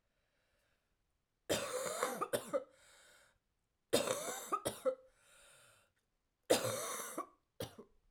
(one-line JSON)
{"three_cough_length": "8.1 s", "three_cough_amplitude": 4730, "three_cough_signal_mean_std_ratio": 0.42, "survey_phase": "alpha (2021-03-01 to 2021-08-12)", "age": "18-44", "gender": "Female", "wearing_mask": "No", "symptom_cough_any": true, "symptom_new_continuous_cough": true, "symptom_fatigue": true, "symptom_fever_high_temperature": true, "symptom_headache": true, "symptom_change_to_sense_of_smell_or_taste": true, "symptom_onset": "2 days", "smoker_status": "Ex-smoker", "respiratory_condition_asthma": false, "respiratory_condition_other": false, "recruitment_source": "Test and Trace", "submission_delay": "1 day", "covid_test_result": "Positive", "covid_test_method": "RT-qPCR"}